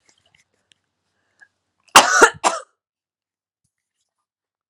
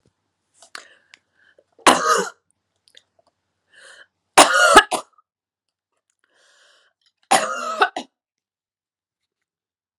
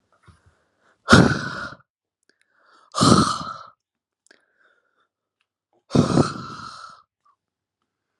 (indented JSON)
{
  "cough_length": "4.7 s",
  "cough_amplitude": 32768,
  "cough_signal_mean_std_ratio": 0.21,
  "three_cough_length": "10.0 s",
  "three_cough_amplitude": 32768,
  "three_cough_signal_mean_std_ratio": 0.26,
  "exhalation_length": "8.2 s",
  "exhalation_amplitude": 32768,
  "exhalation_signal_mean_std_ratio": 0.29,
  "survey_phase": "alpha (2021-03-01 to 2021-08-12)",
  "age": "18-44",
  "gender": "Female",
  "wearing_mask": "No",
  "symptom_loss_of_taste": true,
  "smoker_status": "Ex-smoker",
  "respiratory_condition_asthma": false,
  "respiratory_condition_other": false,
  "recruitment_source": "Test and Trace",
  "submission_delay": "1 day",
  "covid_test_result": "Positive",
  "covid_test_method": "LFT"
}